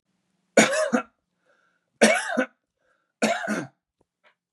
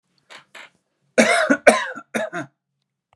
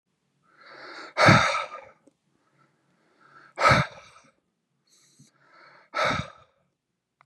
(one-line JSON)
{"three_cough_length": "4.5 s", "three_cough_amplitude": 29290, "three_cough_signal_mean_std_ratio": 0.37, "cough_length": "3.2 s", "cough_amplitude": 32768, "cough_signal_mean_std_ratio": 0.36, "exhalation_length": "7.3 s", "exhalation_amplitude": 24247, "exhalation_signal_mean_std_ratio": 0.3, "survey_phase": "beta (2021-08-13 to 2022-03-07)", "age": "18-44", "gender": "Male", "wearing_mask": "No", "symptom_none": true, "smoker_status": "Never smoked", "respiratory_condition_asthma": false, "respiratory_condition_other": false, "recruitment_source": "Test and Trace", "submission_delay": "4 days", "covid_test_result": "Positive", "covid_test_method": "RT-qPCR", "covid_ct_value": 30.5, "covid_ct_gene": "ORF1ab gene", "covid_ct_mean": 30.9, "covid_viral_load": "72 copies/ml", "covid_viral_load_category": "Minimal viral load (< 10K copies/ml)"}